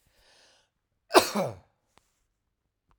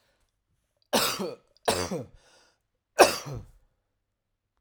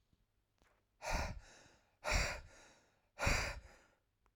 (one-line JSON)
{"cough_length": "3.0 s", "cough_amplitude": 27703, "cough_signal_mean_std_ratio": 0.2, "three_cough_length": "4.6 s", "three_cough_amplitude": 27543, "three_cough_signal_mean_std_ratio": 0.29, "exhalation_length": "4.4 s", "exhalation_amplitude": 3061, "exhalation_signal_mean_std_ratio": 0.41, "survey_phase": "alpha (2021-03-01 to 2021-08-12)", "age": "45-64", "gender": "Male", "wearing_mask": "No", "symptom_none": true, "symptom_onset": "7 days", "smoker_status": "Ex-smoker", "respiratory_condition_asthma": false, "respiratory_condition_other": false, "recruitment_source": "Test and Trace", "submission_delay": "1 day", "covid_test_result": "Positive", "covid_test_method": "RT-qPCR", "covid_ct_value": 36.4, "covid_ct_gene": "ORF1ab gene"}